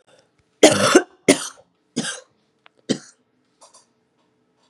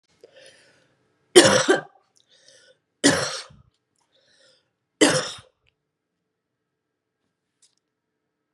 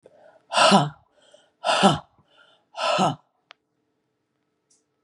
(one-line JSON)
{"cough_length": "4.7 s", "cough_amplitude": 32768, "cough_signal_mean_std_ratio": 0.27, "three_cough_length": "8.5 s", "three_cough_amplitude": 32767, "three_cough_signal_mean_std_ratio": 0.24, "exhalation_length": "5.0 s", "exhalation_amplitude": 24544, "exhalation_signal_mean_std_ratio": 0.35, "survey_phase": "beta (2021-08-13 to 2022-03-07)", "age": "45-64", "gender": "Female", "wearing_mask": "No", "symptom_cough_any": true, "symptom_runny_or_blocked_nose": true, "symptom_sore_throat": true, "symptom_fatigue": true, "symptom_headache": true, "symptom_other": true, "symptom_onset": "3 days", "smoker_status": "Ex-smoker", "respiratory_condition_asthma": false, "respiratory_condition_other": false, "recruitment_source": "Test and Trace", "submission_delay": "2 days", "covid_test_result": "Positive", "covid_test_method": "RT-qPCR", "covid_ct_value": 22.4, "covid_ct_gene": "ORF1ab gene", "covid_ct_mean": 22.9, "covid_viral_load": "31000 copies/ml", "covid_viral_load_category": "Low viral load (10K-1M copies/ml)"}